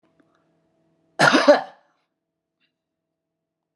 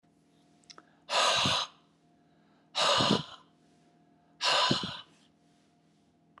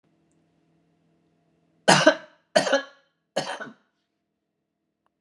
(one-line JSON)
{"cough_length": "3.8 s", "cough_amplitude": 28135, "cough_signal_mean_std_ratio": 0.25, "exhalation_length": "6.4 s", "exhalation_amplitude": 8713, "exhalation_signal_mean_std_ratio": 0.42, "three_cough_length": "5.2 s", "three_cough_amplitude": 32133, "three_cough_signal_mean_std_ratio": 0.25, "survey_phase": "beta (2021-08-13 to 2022-03-07)", "age": "65+", "gender": "Male", "wearing_mask": "No", "symptom_headache": true, "symptom_onset": "12 days", "smoker_status": "Never smoked", "respiratory_condition_asthma": false, "respiratory_condition_other": false, "recruitment_source": "REACT", "submission_delay": "1 day", "covid_test_result": "Negative", "covid_test_method": "RT-qPCR", "influenza_a_test_result": "Negative", "influenza_b_test_result": "Negative"}